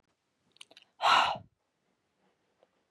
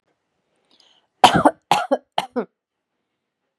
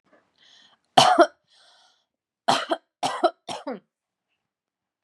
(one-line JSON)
{"exhalation_length": "2.9 s", "exhalation_amplitude": 8922, "exhalation_signal_mean_std_ratio": 0.27, "cough_length": "3.6 s", "cough_amplitude": 32768, "cough_signal_mean_std_ratio": 0.26, "three_cough_length": "5.0 s", "three_cough_amplitude": 32628, "three_cough_signal_mean_std_ratio": 0.28, "survey_phase": "beta (2021-08-13 to 2022-03-07)", "age": "18-44", "gender": "Female", "wearing_mask": "No", "symptom_none": true, "smoker_status": "Current smoker (1 to 10 cigarettes per day)", "respiratory_condition_asthma": false, "respiratory_condition_other": false, "recruitment_source": "REACT", "submission_delay": "2 days", "covid_test_result": "Negative", "covid_test_method": "RT-qPCR", "influenza_a_test_result": "Negative", "influenza_b_test_result": "Negative"}